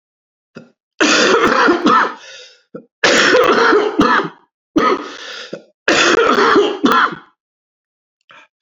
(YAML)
three_cough_length: 8.6 s
three_cough_amplitude: 32768
three_cough_signal_mean_std_ratio: 0.62
survey_phase: beta (2021-08-13 to 2022-03-07)
age: 65+
gender: Male
wearing_mask: 'No'
symptom_cough_any: true
symptom_runny_or_blocked_nose: true
symptom_diarrhoea: true
symptom_fatigue: true
symptom_fever_high_temperature: true
symptom_other: true
symptom_onset: 5 days
smoker_status: Never smoked
respiratory_condition_asthma: false
respiratory_condition_other: false
recruitment_source: Test and Trace
submission_delay: 2 days
covid_test_result: Positive
covid_test_method: RT-qPCR
covid_ct_value: 14.8
covid_ct_gene: ORF1ab gene
covid_ct_mean: 15.1
covid_viral_load: 11000000 copies/ml
covid_viral_load_category: High viral load (>1M copies/ml)